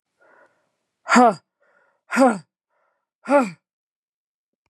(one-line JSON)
{"exhalation_length": "4.7 s", "exhalation_amplitude": 29067, "exhalation_signal_mean_std_ratio": 0.29, "survey_phase": "beta (2021-08-13 to 2022-03-07)", "age": "45-64", "gender": "Female", "wearing_mask": "No", "symptom_cough_any": true, "symptom_new_continuous_cough": true, "symptom_runny_or_blocked_nose": true, "symptom_shortness_of_breath": true, "symptom_sore_throat": true, "symptom_fatigue": true, "symptom_headache": true, "symptom_onset": "4 days", "smoker_status": "Never smoked", "respiratory_condition_asthma": true, "respiratory_condition_other": false, "recruitment_source": "Test and Trace", "submission_delay": "2 days", "covid_test_result": "Positive", "covid_test_method": "ePCR"}